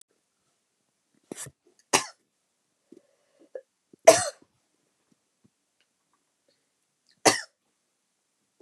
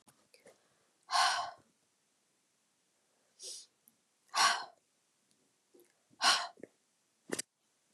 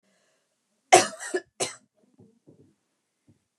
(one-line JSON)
{"three_cough_length": "8.6 s", "three_cough_amplitude": 29451, "three_cough_signal_mean_std_ratio": 0.15, "exhalation_length": "7.9 s", "exhalation_amplitude": 5917, "exhalation_signal_mean_std_ratio": 0.28, "cough_length": "3.6 s", "cough_amplitude": 28022, "cough_signal_mean_std_ratio": 0.2, "survey_phase": "beta (2021-08-13 to 2022-03-07)", "age": "18-44", "gender": "Female", "wearing_mask": "No", "symptom_cough_any": true, "symptom_new_continuous_cough": true, "symptom_runny_or_blocked_nose": true, "symptom_shortness_of_breath": true, "symptom_abdominal_pain": true, "symptom_diarrhoea": true, "symptom_fatigue": true, "symptom_fever_high_temperature": true, "symptom_headache": true, "symptom_change_to_sense_of_smell_or_taste": true, "symptom_loss_of_taste": true, "symptom_onset": "4 days", "smoker_status": "Never smoked", "respiratory_condition_asthma": false, "respiratory_condition_other": false, "recruitment_source": "Test and Trace", "submission_delay": "2 days", "covid_test_result": "Positive", "covid_test_method": "RT-qPCR", "covid_ct_value": 16.8, "covid_ct_gene": "ORF1ab gene", "covid_ct_mean": 17.2, "covid_viral_load": "2300000 copies/ml", "covid_viral_load_category": "High viral load (>1M copies/ml)"}